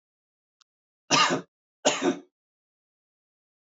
{
  "cough_length": "3.8 s",
  "cough_amplitude": 15187,
  "cough_signal_mean_std_ratio": 0.3,
  "survey_phase": "alpha (2021-03-01 to 2021-08-12)",
  "age": "45-64",
  "gender": "Male",
  "wearing_mask": "No",
  "symptom_none": true,
  "symptom_onset": "2 days",
  "smoker_status": "Never smoked",
  "respiratory_condition_asthma": false,
  "respiratory_condition_other": false,
  "recruitment_source": "REACT",
  "submission_delay": "1 day",
  "covid_test_result": "Negative",
  "covid_test_method": "RT-qPCR"
}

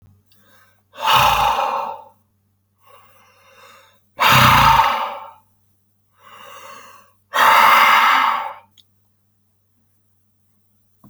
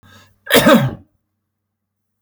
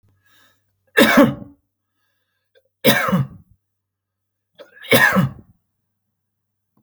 {
  "exhalation_length": "11.1 s",
  "exhalation_amplitude": 31152,
  "exhalation_signal_mean_std_ratio": 0.43,
  "cough_length": "2.2 s",
  "cough_amplitude": 32768,
  "cough_signal_mean_std_ratio": 0.35,
  "three_cough_length": "6.8 s",
  "three_cough_amplitude": 32768,
  "three_cough_signal_mean_std_ratio": 0.33,
  "survey_phase": "alpha (2021-03-01 to 2021-08-12)",
  "age": "45-64",
  "gender": "Male",
  "wearing_mask": "No",
  "symptom_none": true,
  "smoker_status": "Ex-smoker",
  "respiratory_condition_asthma": false,
  "respiratory_condition_other": false,
  "recruitment_source": "REACT",
  "submission_delay": "1 day",
  "covid_test_result": "Negative",
  "covid_test_method": "RT-qPCR"
}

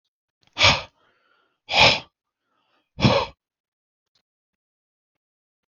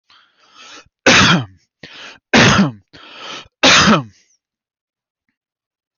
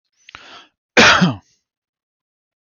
{
  "exhalation_length": "5.7 s",
  "exhalation_amplitude": 24320,
  "exhalation_signal_mean_std_ratio": 0.27,
  "three_cough_length": "6.0 s",
  "three_cough_amplitude": 32768,
  "three_cough_signal_mean_std_ratio": 0.4,
  "cough_length": "2.6 s",
  "cough_amplitude": 32768,
  "cough_signal_mean_std_ratio": 0.32,
  "survey_phase": "beta (2021-08-13 to 2022-03-07)",
  "age": "18-44",
  "gender": "Male",
  "wearing_mask": "No",
  "symptom_none": true,
  "smoker_status": "Ex-smoker",
  "respiratory_condition_asthma": false,
  "respiratory_condition_other": false,
  "recruitment_source": "REACT",
  "submission_delay": "3 days",
  "covid_test_result": "Negative",
  "covid_test_method": "RT-qPCR",
  "influenza_a_test_result": "Negative",
  "influenza_b_test_result": "Negative"
}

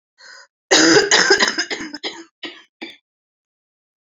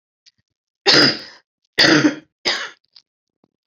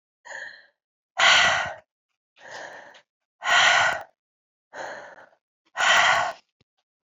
{
  "cough_length": "4.0 s",
  "cough_amplitude": 30287,
  "cough_signal_mean_std_ratio": 0.42,
  "three_cough_length": "3.7 s",
  "three_cough_amplitude": 32767,
  "three_cough_signal_mean_std_ratio": 0.38,
  "exhalation_length": "7.2 s",
  "exhalation_amplitude": 18958,
  "exhalation_signal_mean_std_ratio": 0.42,
  "survey_phase": "beta (2021-08-13 to 2022-03-07)",
  "age": "18-44",
  "gender": "Female",
  "wearing_mask": "No",
  "symptom_cough_any": true,
  "symptom_runny_or_blocked_nose": true,
  "symptom_sore_throat": true,
  "symptom_fatigue": true,
  "symptom_headache": true,
  "symptom_change_to_sense_of_smell_or_taste": true,
  "symptom_loss_of_taste": true,
  "symptom_onset": "5 days",
  "smoker_status": "Ex-smoker",
  "respiratory_condition_asthma": false,
  "respiratory_condition_other": false,
  "recruitment_source": "Test and Trace",
  "submission_delay": "3 days",
  "covid_test_result": "Positive",
  "covid_test_method": "RT-qPCR",
  "covid_ct_value": 19.8,
  "covid_ct_gene": "ORF1ab gene",
  "covid_ct_mean": 20.7,
  "covid_viral_load": "170000 copies/ml",
  "covid_viral_load_category": "Low viral load (10K-1M copies/ml)"
}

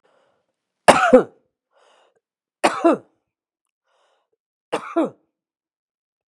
{
  "cough_length": "6.3 s",
  "cough_amplitude": 32768,
  "cough_signal_mean_std_ratio": 0.24,
  "survey_phase": "beta (2021-08-13 to 2022-03-07)",
  "age": "65+",
  "gender": "Female",
  "wearing_mask": "No",
  "symptom_runny_or_blocked_nose": true,
  "symptom_sore_throat": true,
  "smoker_status": "Ex-smoker",
  "respiratory_condition_asthma": true,
  "respiratory_condition_other": true,
  "recruitment_source": "Test and Trace",
  "submission_delay": "3 days",
  "covid_test_result": "Negative",
  "covid_test_method": "ePCR"
}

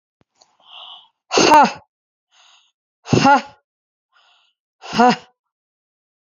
{
  "exhalation_length": "6.2 s",
  "exhalation_amplitude": 29067,
  "exhalation_signal_mean_std_ratio": 0.31,
  "survey_phase": "beta (2021-08-13 to 2022-03-07)",
  "age": "65+",
  "gender": "Female",
  "wearing_mask": "No",
  "symptom_runny_or_blocked_nose": true,
  "symptom_shortness_of_breath": true,
  "symptom_onset": "6 days",
  "smoker_status": "Ex-smoker",
  "respiratory_condition_asthma": false,
  "respiratory_condition_other": false,
  "recruitment_source": "Test and Trace",
  "submission_delay": "2 days",
  "covid_test_result": "Positive",
  "covid_test_method": "ePCR"
}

